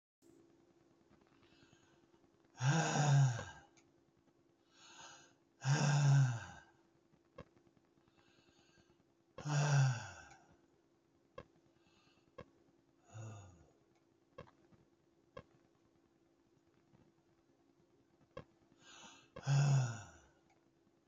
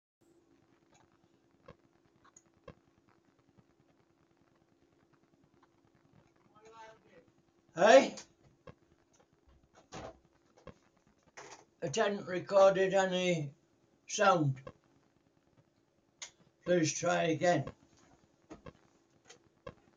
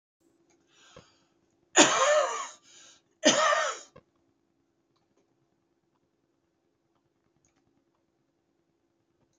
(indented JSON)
{
  "exhalation_length": "21.1 s",
  "exhalation_amplitude": 2541,
  "exhalation_signal_mean_std_ratio": 0.34,
  "three_cough_length": "20.0 s",
  "three_cough_amplitude": 9949,
  "three_cough_signal_mean_std_ratio": 0.31,
  "cough_length": "9.4 s",
  "cough_amplitude": 20450,
  "cough_signal_mean_std_ratio": 0.27,
  "survey_phase": "beta (2021-08-13 to 2022-03-07)",
  "age": "65+",
  "gender": "Male",
  "wearing_mask": "No",
  "symptom_none": true,
  "smoker_status": "Ex-smoker",
  "respiratory_condition_asthma": false,
  "respiratory_condition_other": false,
  "recruitment_source": "REACT",
  "submission_delay": "3 days",
  "covid_test_result": "Negative",
  "covid_test_method": "RT-qPCR"
}